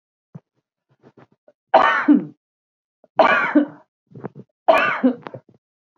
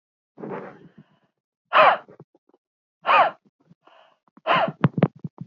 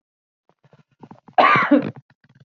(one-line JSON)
{"three_cough_length": "6.0 s", "three_cough_amplitude": 27343, "three_cough_signal_mean_std_ratio": 0.37, "exhalation_length": "5.5 s", "exhalation_amplitude": 25400, "exhalation_signal_mean_std_ratio": 0.33, "cough_length": "2.5 s", "cough_amplitude": 26879, "cough_signal_mean_std_ratio": 0.35, "survey_phase": "beta (2021-08-13 to 2022-03-07)", "age": "45-64", "gender": "Female", "wearing_mask": "No", "symptom_none": true, "smoker_status": "Ex-smoker", "respiratory_condition_asthma": false, "respiratory_condition_other": false, "recruitment_source": "REACT", "submission_delay": "1 day", "covid_test_result": "Negative", "covid_test_method": "RT-qPCR", "influenza_a_test_result": "Negative", "influenza_b_test_result": "Negative"}